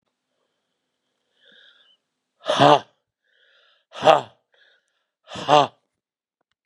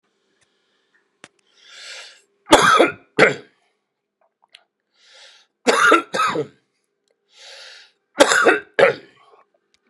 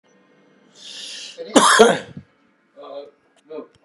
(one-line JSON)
{"exhalation_length": "6.7 s", "exhalation_amplitude": 32767, "exhalation_signal_mean_std_ratio": 0.23, "three_cough_length": "9.9 s", "three_cough_amplitude": 32768, "three_cough_signal_mean_std_ratio": 0.33, "cough_length": "3.8 s", "cough_amplitude": 32768, "cough_signal_mean_std_ratio": 0.32, "survey_phase": "beta (2021-08-13 to 2022-03-07)", "age": "65+", "gender": "Male", "wearing_mask": "No", "symptom_cough_any": true, "symptom_new_continuous_cough": true, "symptom_runny_or_blocked_nose": true, "symptom_change_to_sense_of_smell_or_taste": true, "symptom_loss_of_taste": true, "smoker_status": "Current smoker (1 to 10 cigarettes per day)", "respiratory_condition_asthma": false, "respiratory_condition_other": false, "recruitment_source": "Test and Trace", "submission_delay": "2 days", "covid_test_result": "Positive", "covid_test_method": "RT-qPCR", "covid_ct_value": 23.0, "covid_ct_gene": "ORF1ab gene", "covid_ct_mean": 23.5, "covid_viral_load": "20000 copies/ml", "covid_viral_load_category": "Low viral load (10K-1M copies/ml)"}